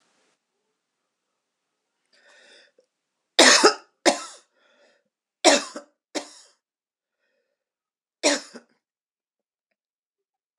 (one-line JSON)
{"cough_length": "10.6 s", "cough_amplitude": 26028, "cough_signal_mean_std_ratio": 0.21, "survey_phase": "beta (2021-08-13 to 2022-03-07)", "age": "65+", "gender": "Female", "wearing_mask": "No", "symptom_runny_or_blocked_nose": true, "smoker_status": "Ex-smoker", "respiratory_condition_asthma": false, "respiratory_condition_other": false, "recruitment_source": "REACT", "submission_delay": "11 days", "covid_test_result": "Negative", "covid_test_method": "RT-qPCR", "influenza_a_test_result": "Negative", "influenza_b_test_result": "Negative"}